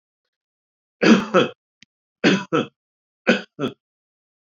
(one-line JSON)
{"three_cough_length": "4.5 s", "three_cough_amplitude": 28691, "three_cough_signal_mean_std_ratio": 0.33, "survey_phase": "beta (2021-08-13 to 2022-03-07)", "age": "65+", "gender": "Male", "wearing_mask": "No", "symptom_none": true, "smoker_status": "Ex-smoker", "respiratory_condition_asthma": false, "respiratory_condition_other": false, "recruitment_source": "REACT", "submission_delay": "2 days", "covid_test_result": "Negative", "covid_test_method": "RT-qPCR"}